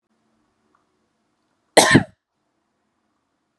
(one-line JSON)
{"cough_length": "3.6 s", "cough_amplitude": 32768, "cough_signal_mean_std_ratio": 0.2, "survey_phase": "beta (2021-08-13 to 2022-03-07)", "age": "18-44", "gender": "Female", "wearing_mask": "No", "symptom_none": true, "smoker_status": "Prefer not to say", "respiratory_condition_asthma": false, "respiratory_condition_other": false, "recruitment_source": "REACT", "submission_delay": "1 day", "covid_test_result": "Negative", "covid_test_method": "RT-qPCR"}